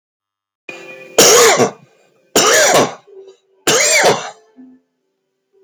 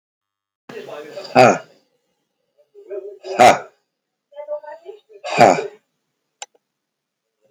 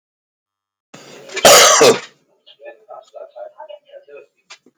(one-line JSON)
{"three_cough_length": "5.6 s", "three_cough_amplitude": 32768, "three_cough_signal_mean_std_ratio": 0.5, "exhalation_length": "7.5 s", "exhalation_amplitude": 32768, "exhalation_signal_mean_std_ratio": 0.28, "cough_length": "4.8 s", "cough_amplitude": 32768, "cough_signal_mean_std_ratio": 0.33, "survey_phase": "beta (2021-08-13 to 2022-03-07)", "age": "45-64", "gender": "Male", "wearing_mask": "No", "symptom_none": true, "smoker_status": "Current smoker (11 or more cigarettes per day)", "respiratory_condition_asthma": false, "respiratory_condition_other": false, "recruitment_source": "REACT", "submission_delay": "11 days", "covid_test_result": "Negative", "covid_test_method": "RT-qPCR", "influenza_a_test_result": "Negative", "influenza_b_test_result": "Negative"}